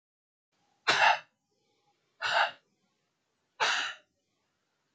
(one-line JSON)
{"exhalation_length": "4.9 s", "exhalation_amplitude": 9279, "exhalation_signal_mean_std_ratio": 0.33, "survey_phase": "beta (2021-08-13 to 2022-03-07)", "age": "18-44", "gender": "Male", "wearing_mask": "No", "symptom_none": true, "smoker_status": "Never smoked", "respiratory_condition_asthma": false, "respiratory_condition_other": false, "recruitment_source": "REACT", "submission_delay": "2 days", "covid_test_result": "Negative", "covid_test_method": "RT-qPCR", "influenza_a_test_result": "Negative", "influenza_b_test_result": "Negative"}